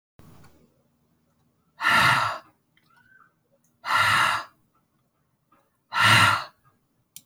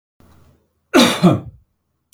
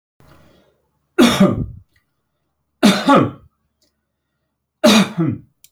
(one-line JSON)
{"exhalation_length": "7.3 s", "exhalation_amplitude": 19798, "exhalation_signal_mean_std_ratio": 0.38, "cough_length": "2.1 s", "cough_amplitude": 28528, "cough_signal_mean_std_ratio": 0.36, "three_cough_length": "5.7 s", "three_cough_amplitude": 29758, "three_cough_signal_mean_std_ratio": 0.38, "survey_phase": "beta (2021-08-13 to 2022-03-07)", "age": "65+", "gender": "Male", "wearing_mask": "No", "symptom_none": true, "smoker_status": "Never smoked", "respiratory_condition_asthma": false, "respiratory_condition_other": false, "recruitment_source": "REACT", "submission_delay": "1 day", "covid_test_result": "Negative", "covid_test_method": "RT-qPCR"}